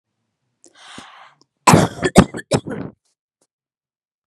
{"cough_length": "4.3 s", "cough_amplitude": 32768, "cough_signal_mean_std_ratio": 0.27, "survey_phase": "beta (2021-08-13 to 2022-03-07)", "age": "45-64", "gender": "Female", "wearing_mask": "No", "symptom_none": true, "smoker_status": "Ex-smoker", "respiratory_condition_asthma": false, "respiratory_condition_other": false, "recruitment_source": "REACT", "submission_delay": "1 day", "covid_test_result": "Negative", "covid_test_method": "RT-qPCR", "influenza_a_test_result": "Negative", "influenza_b_test_result": "Negative"}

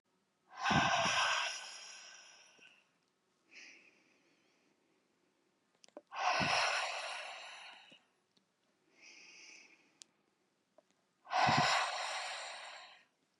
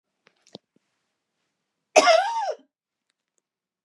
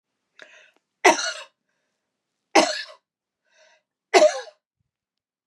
{"exhalation_length": "13.4 s", "exhalation_amplitude": 3953, "exhalation_signal_mean_std_ratio": 0.43, "cough_length": "3.8 s", "cough_amplitude": 30770, "cough_signal_mean_std_ratio": 0.27, "three_cough_length": "5.5 s", "three_cough_amplitude": 28841, "three_cough_signal_mean_std_ratio": 0.26, "survey_phase": "beta (2021-08-13 to 2022-03-07)", "age": "45-64", "gender": "Female", "wearing_mask": "No", "symptom_none": true, "smoker_status": "Never smoked", "respiratory_condition_asthma": false, "respiratory_condition_other": false, "recruitment_source": "REACT", "submission_delay": "1 day", "covid_test_result": "Negative", "covid_test_method": "RT-qPCR", "influenza_a_test_result": "Negative", "influenza_b_test_result": "Negative"}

